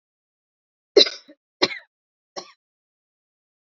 three_cough_length: 3.8 s
three_cough_amplitude: 31523
three_cough_signal_mean_std_ratio: 0.17
survey_phase: beta (2021-08-13 to 2022-03-07)
age: 18-44
gender: Female
wearing_mask: 'No'
symptom_cough_any: true
symptom_fatigue: true
symptom_headache: true
symptom_onset: 6 days
smoker_status: Never smoked
respiratory_condition_asthma: false
respiratory_condition_other: false
recruitment_source: Test and Trace
submission_delay: 1 day
covid_test_result: Positive
covid_test_method: ePCR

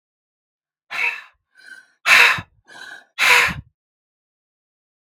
exhalation_length: 5.0 s
exhalation_amplitude: 32768
exhalation_signal_mean_std_ratio: 0.33
survey_phase: beta (2021-08-13 to 2022-03-07)
age: 18-44
gender: Male
wearing_mask: 'No'
symptom_none: true
smoker_status: Never smoked
respiratory_condition_asthma: false
respiratory_condition_other: false
recruitment_source: REACT
submission_delay: 2 days
covid_test_result: Negative
covid_test_method: RT-qPCR
influenza_a_test_result: Negative
influenza_b_test_result: Negative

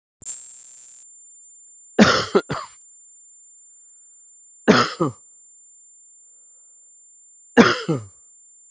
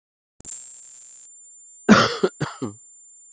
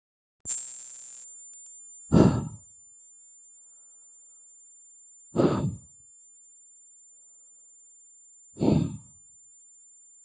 three_cough_length: 8.7 s
three_cough_amplitude: 32768
three_cough_signal_mean_std_ratio: 0.31
cough_length: 3.3 s
cough_amplitude: 32768
cough_signal_mean_std_ratio: 0.33
exhalation_length: 10.2 s
exhalation_amplitude: 18801
exhalation_signal_mean_std_ratio: 0.34
survey_phase: beta (2021-08-13 to 2022-03-07)
age: 45-64
gender: Male
wearing_mask: Prefer not to say
symptom_cough_any: true
symptom_runny_or_blocked_nose: true
symptom_fatigue: true
symptom_fever_high_temperature: true
smoker_status: Ex-smoker
respiratory_condition_asthma: false
respiratory_condition_other: false
recruitment_source: Test and Trace
submission_delay: 2 days
covid_test_result: Positive
covid_test_method: ePCR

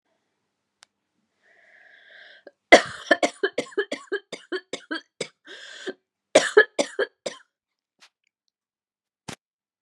cough_length: 9.8 s
cough_amplitude: 32767
cough_signal_mean_std_ratio: 0.22
survey_phase: beta (2021-08-13 to 2022-03-07)
age: 45-64
gender: Female
wearing_mask: 'No'
symptom_new_continuous_cough: true
symptom_runny_or_blocked_nose: true
symptom_shortness_of_breath: true
symptom_sore_throat: true
symptom_fatigue: true
symptom_fever_high_temperature: true
symptom_headache: true
symptom_change_to_sense_of_smell_or_taste: true
symptom_onset: 3 days
smoker_status: Never smoked
respiratory_condition_asthma: false
respiratory_condition_other: false
recruitment_source: Test and Trace
submission_delay: 2 days
covid_test_result: Positive
covid_test_method: RT-qPCR
covid_ct_value: 25.1
covid_ct_gene: ORF1ab gene
covid_ct_mean: 25.7
covid_viral_load: 3700 copies/ml
covid_viral_load_category: Minimal viral load (< 10K copies/ml)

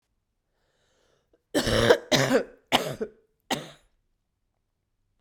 cough_length: 5.2 s
cough_amplitude: 22583
cough_signal_mean_std_ratio: 0.34
survey_phase: beta (2021-08-13 to 2022-03-07)
age: 18-44
gender: Female
wearing_mask: 'No'
symptom_cough_any: true
symptom_runny_or_blocked_nose: true
symptom_fatigue: true
symptom_fever_high_temperature: true
symptom_headache: true
symptom_change_to_sense_of_smell_or_taste: true
symptom_loss_of_taste: true
symptom_other: true
symptom_onset: 4 days
smoker_status: Ex-smoker
respiratory_condition_asthma: false
respiratory_condition_other: false
recruitment_source: Test and Trace
submission_delay: 2 days
covid_test_result: Positive
covid_test_method: RT-qPCR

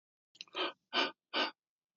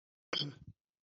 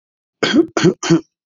exhalation_length: 2.0 s
exhalation_amplitude: 3854
exhalation_signal_mean_std_ratio: 0.4
cough_length: 1.0 s
cough_amplitude: 2522
cough_signal_mean_std_ratio: 0.36
three_cough_length: 1.5 s
three_cough_amplitude: 28094
three_cough_signal_mean_std_ratio: 0.49
survey_phase: beta (2021-08-13 to 2022-03-07)
age: 45-64
gender: Male
wearing_mask: 'No'
symptom_none: true
smoker_status: Never smoked
respiratory_condition_asthma: false
respiratory_condition_other: false
recruitment_source: REACT
submission_delay: 1 day
covid_test_result: Negative
covid_test_method: RT-qPCR
influenza_a_test_result: Negative
influenza_b_test_result: Negative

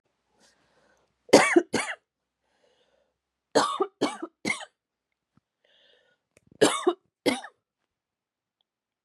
three_cough_length: 9.0 s
three_cough_amplitude: 27868
three_cough_signal_mean_std_ratio: 0.26
survey_phase: beta (2021-08-13 to 2022-03-07)
age: 18-44
gender: Female
wearing_mask: 'No'
symptom_cough_any: true
symptom_sore_throat: true
symptom_fatigue: true
symptom_onset: 2 days
smoker_status: Never smoked
respiratory_condition_asthma: false
respiratory_condition_other: false
recruitment_source: Test and Trace
submission_delay: 1 day
covid_test_result: Negative
covid_test_method: RT-qPCR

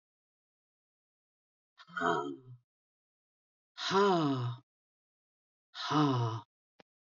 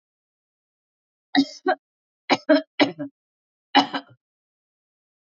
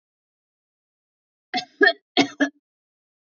exhalation_length: 7.2 s
exhalation_amplitude: 5191
exhalation_signal_mean_std_ratio: 0.4
three_cough_length: 5.2 s
three_cough_amplitude: 25882
three_cough_signal_mean_std_ratio: 0.27
cough_length: 3.2 s
cough_amplitude: 24188
cough_signal_mean_std_ratio: 0.25
survey_phase: beta (2021-08-13 to 2022-03-07)
age: 65+
gender: Female
wearing_mask: 'No'
symptom_sore_throat: true
smoker_status: Never smoked
respiratory_condition_asthma: false
respiratory_condition_other: false
recruitment_source: REACT
submission_delay: 1 day
covid_test_result: Negative
covid_test_method: RT-qPCR
influenza_a_test_result: Negative
influenza_b_test_result: Negative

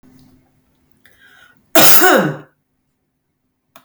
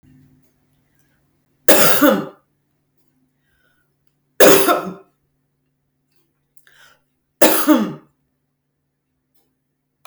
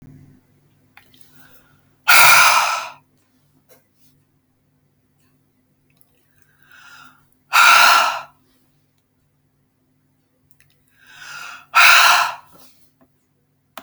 cough_length: 3.8 s
cough_amplitude: 32768
cough_signal_mean_std_ratio: 0.32
three_cough_length: 10.1 s
three_cough_amplitude: 32768
three_cough_signal_mean_std_ratio: 0.29
exhalation_length: 13.8 s
exhalation_amplitude: 32768
exhalation_signal_mean_std_ratio: 0.31
survey_phase: beta (2021-08-13 to 2022-03-07)
age: 45-64
gender: Female
wearing_mask: 'No'
symptom_headache: true
smoker_status: Ex-smoker
respiratory_condition_asthma: false
respiratory_condition_other: false
recruitment_source: REACT
submission_delay: 2 days
covid_test_result: Negative
covid_test_method: RT-qPCR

